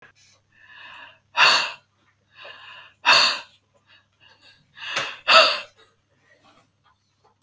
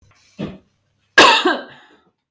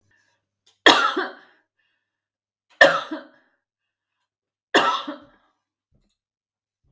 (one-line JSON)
{"exhalation_length": "7.4 s", "exhalation_amplitude": 30507, "exhalation_signal_mean_std_ratio": 0.31, "cough_length": "2.3 s", "cough_amplitude": 32767, "cough_signal_mean_std_ratio": 0.35, "three_cough_length": "6.9 s", "three_cough_amplitude": 32768, "three_cough_signal_mean_std_ratio": 0.26, "survey_phase": "beta (2021-08-13 to 2022-03-07)", "age": "45-64", "gender": "Female", "wearing_mask": "No", "symptom_none": true, "smoker_status": "Never smoked", "respiratory_condition_asthma": false, "respiratory_condition_other": false, "recruitment_source": "Test and Trace", "submission_delay": "1 day", "covid_test_result": "Negative", "covid_test_method": "RT-qPCR"}